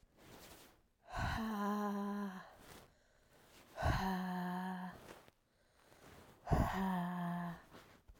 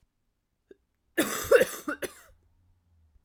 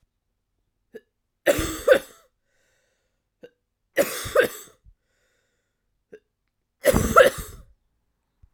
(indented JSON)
{
  "exhalation_length": "8.2 s",
  "exhalation_amplitude": 2961,
  "exhalation_signal_mean_std_ratio": 0.63,
  "cough_length": "3.2 s",
  "cough_amplitude": 12942,
  "cough_signal_mean_std_ratio": 0.29,
  "three_cough_length": "8.5 s",
  "three_cough_amplitude": 28019,
  "three_cough_signal_mean_std_ratio": 0.28,
  "survey_phase": "alpha (2021-03-01 to 2021-08-12)",
  "age": "18-44",
  "gender": "Male",
  "wearing_mask": "No",
  "symptom_cough_any": true,
  "symptom_new_continuous_cough": true,
  "symptom_shortness_of_breath": true,
  "symptom_fatigue": true,
  "symptom_fever_high_temperature": true,
  "symptom_headache": true,
  "symptom_onset": "7 days",
  "smoker_status": "Ex-smoker",
  "respiratory_condition_asthma": false,
  "respiratory_condition_other": false,
  "recruitment_source": "Test and Trace",
  "submission_delay": "2 days",
  "covid_test_result": "Positive",
  "covid_test_method": "RT-qPCR",
  "covid_ct_value": 16.8,
  "covid_ct_gene": "ORF1ab gene",
  "covid_ct_mean": 17.3,
  "covid_viral_load": "2000000 copies/ml",
  "covid_viral_load_category": "High viral load (>1M copies/ml)"
}